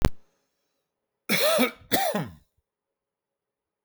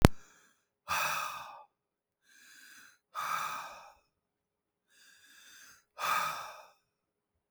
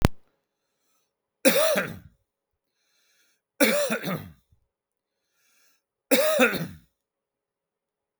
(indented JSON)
{
  "cough_length": "3.8 s",
  "cough_amplitude": 32768,
  "cough_signal_mean_std_ratio": 0.38,
  "exhalation_length": "7.5 s",
  "exhalation_amplitude": 32768,
  "exhalation_signal_mean_std_ratio": 0.3,
  "three_cough_length": "8.2 s",
  "three_cough_amplitude": 32768,
  "three_cough_signal_mean_std_ratio": 0.35,
  "survey_phase": "beta (2021-08-13 to 2022-03-07)",
  "age": "45-64",
  "gender": "Male",
  "wearing_mask": "No",
  "symptom_cough_any": true,
  "symptom_shortness_of_breath": true,
  "smoker_status": "Never smoked",
  "respiratory_condition_asthma": false,
  "respiratory_condition_other": false,
  "recruitment_source": "REACT",
  "submission_delay": "2 days",
  "covid_test_result": "Negative",
  "covid_test_method": "RT-qPCR",
  "influenza_a_test_result": "Negative",
  "influenza_b_test_result": "Negative"
}